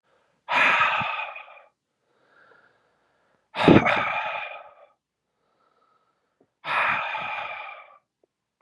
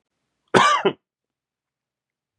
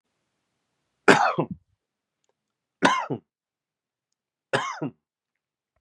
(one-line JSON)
{"exhalation_length": "8.6 s", "exhalation_amplitude": 31142, "exhalation_signal_mean_std_ratio": 0.39, "cough_length": "2.4 s", "cough_amplitude": 32424, "cough_signal_mean_std_ratio": 0.3, "three_cough_length": "5.8 s", "three_cough_amplitude": 31689, "three_cough_signal_mean_std_ratio": 0.26, "survey_phase": "beta (2021-08-13 to 2022-03-07)", "age": "18-44", "gender": "Male", "wearing_mask": "No", "symptom_sore_throat": true, "symptom_diarrhoea": true, "symptom_fatigue": true, "symptom_fever_high_temperature": true, "symptom_headache": true, "symptom_onset": "3 days", "smoker_status": "Never smoked", "respiratory_condition_asthma": false, "respiratory_condition_other": false, "recruitment_source": "Test and Trace", "submission_delay": "2 days", "covid_test_result": "Positive", "covid_test_method": "RT-qPCR", "covid_ct_value": 17.8, "covid_ct_gene": "ORF1ab gene"}